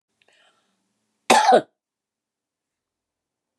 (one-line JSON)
{"cough_length": "3.6 s", "cough_amplitude": 28491, "cough_signal_mean_std_ratio": 0.24, "survey_phase": "beta (2021-08-13 to 2022-03-07)", "age": "65+", "gender": "Female", "wearing_mask": "No", "symptom_none": true, "smoker_status": "Never smoked", "respiratory_condition_asthma": false, "respiratory_condition_other": false, "recruitment_source": "REACT", "submission_delay": "3 days", "covid_test_result": "Negative", "covid_test_method": "RT-qPCR", "influenza_a_test_result": "Negative", "influenza_b_test_result": "Negative"}